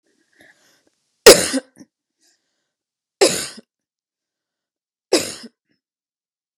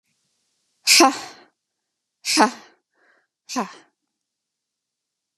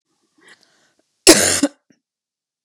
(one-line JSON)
{"three_cough_length": "6.6 s", "three_cough_amplitude": 32768, "three_cough_signal_mean_std_ratio": 0.2, "exhalation_length": "5.4 s", "exhalation_amplitude": 32262, "exhalation_signal_mean_std_ratio": 0.26, "cough_length": "2.6 s", "cough_amplitude": 32768, "cough_signal_mean_std_ratio": 0.27, "survey_phase": "beta (2021-08-13 to 2022-03-07)", "age": "18-44", "gender": "Female", "wearing_mask": "No", "symptom_cough_any": true, "symptom_runny_or_blocked_nose": true, "symptom_sore_throat": true, "symptom_fatigue": true, "symptom_headache": true, "smoker_status": "Never smoked", "respiratory_condition_asthma": false, "respiratory_condition_other": false, "recruitment_source": "Test and Trace", "submission_delay": "2 days", "covid_test_result": "Positive", "covid_test_method": "ePCR"}